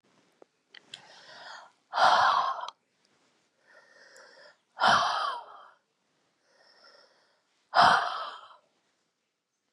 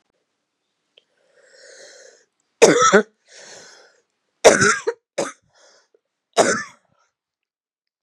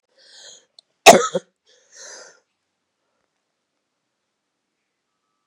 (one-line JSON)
{"exhalation_length": "9.7 s", "exhalation_amplitude": 13950, "exhalation_signal_mean_std_ratio": 0.34, "three_cough_length": "8.0 s", "three_cough_amplitude": 32768, "three_cough_signal_mean_std_ratio": 0.28, "cough_length": "5.5 s", "cough_amplitude": 32768, "cough_signal_mean_std_ratio": 0.15, "survey_phase": "beta (2021-08-13 to 2022-03-07)", "age": "18-44", "gender": "Female", "wearing_mask": "No", "symptom_cough_any": true, "symptom_runny_or_blocked_nose": true, "symptom_sore_throat": true, "symptom_fatigue": true, "symptom_fever_high_temperature": true, "symptom_headache": true, "symptom_onset": "3 days", "smoker_status": "Current smoker (e-cigarettes or vapes only)", "respiratory_condition_asthma": false, "respiratory_condition_other": false, "recruitment_source": "Test and Trace", "submission_delay": "2 days", "covid_test_result": "Positive", "covid_test_method": "RT-qPCR", "covid_ct_value": 25.2, "covid_ct_gene": "ORF1ab gene", "covid_ct_mean": 25.5, "covid_viral_load": "4200 copies/ml", "covid_viral_load_category": "Minimal viral load (< 10K copies/ml)"}